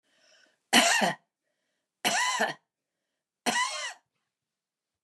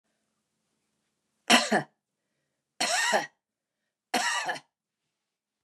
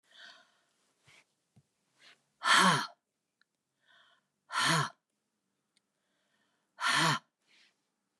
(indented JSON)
{
  "three_cough_length": "5.0 s",
  "three_cough_amplitude": 18303,
  "three_cough_signal_mean_std_ratio": 0.38,
  "cough_length": "5.6 s",
  "cough_amplitude": 19764,
  "cough_signal_mean_std_ratio": 0.34,
  "exhalation_length": "8.2 s",
  "exhalation_amplitude": 9088,
  "exhalation_signal_mean_std_ratio": 0.3,
  "survey_phase": "beta (2021-08-13 to 2022-03-07)",
  "age": "65+",
  "gender": "Female",
  "wearing_mask": "No",
  "symptom_none": true,
  "smoker_status": "Ex-smoker",
  "respiratory_condition_asthma": false,
  "respiratory_condition_other": false,
  "recruitment_source": "REACT",
  "submission_delay": "2 days",
  "covid_test_result": "Negative",
  "covid_test_method": "RT-qPCR",
  "influenza_a_test_result": "Negative",
  "influenza_b_test_result": "Negative"
}